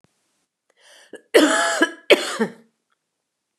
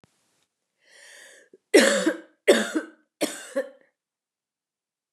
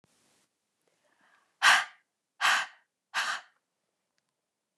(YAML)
cough_length: 3.6 s
cough_amplitude: 29242
cough_signal_mean_std_ratio: 0.35
three_cough_length: 5.1 s
three_cough_amplitude: 21501
three_cough_signal_mean_std_ratio: 0.3
exhalation_length: 4.8 s
exhalation_amplitude: 16107
exhalation_signal_mean_std_ratio: 0.27
survey_phase: beta (2021-08-13 to 2022-03-07)
age: 45-64
gender: Female
wearing_mask: 'No'
symptom_cough_any: true
symptom_runny_or_blocked_nose: true
symptom_fatigue: true
symptom_other: true
smoker_status: Never smoked
respiratory_condition_asthma: false
respiratory_condition_other: false
recruitment_source: Test and Trace
submission_delay: 2 days
covid_test_result: Positive
covid_test_method: RT-qPCR
covid_ct_value: 18.2
covid_ct_gene: ORF1ab gene
covid_ct_mean: 19.5
covid_viral_load: 400000 copies/ml
covid_viral_load_category: Low viral load (10K-1M copies/ml)